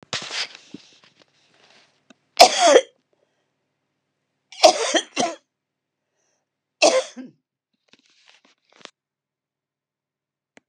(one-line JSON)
{"three_cough_length": "10.7 s", "three_cough_amplitude": 32768, "three_cough_signal_mean_std_ratio": 0.24, "survey_phase": "beta (2021-08-13 to 2022-03-07)", "age": "65+", "gender": "Female", "wearing_mask": "No", "symptom_none": true, "smoker_status": "Ex-smoker", "respiratory_condition_asthma": false, "respiratory_condition_other": false, "recruitment_source": "REACT", "submission_delay": "7 days", "covid_test_result": "Negative", "covid_test_method": "RT-qPCR", "influenza_a_test_result": "Negative", "influenza_b_test_result": "Negative"}